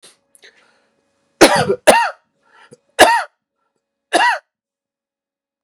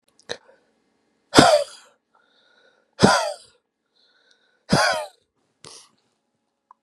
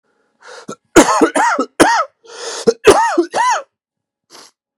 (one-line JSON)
{"three_cough_length": "5.6 s", "three_cough_amplitude": 32768, "three_cough_signal_mean_std_ratio": 0.32, "exhalation_length": "6.8 s", "exhalation_amplitude": 32768, "exhalation_signal_mean_std_ratio": 0.28, "cough_length": "4.8 s", "cough_amplitude": 32768, "cough_signal_mean_std_ratio": 0.48, "survey_phase": "beta (2021-08-13 to 2022-03-07)", "age": "18-44", "gender": "Male", "wearing_mask": "No", "symptom_cough_any": true, "symptom_sore_throat": true, "symptom_onset": "1 day", "smoker_status": "Current smoker (e-cigarettes or vapes only)", "respiratory_condition_asthma": false, "respiratory_condition_other": false, "recruitment_source": "Test and Trace", "submission_delay": "1 day", "covid_test_result": "Negative", "covid_test_method": "RT-qPCR"}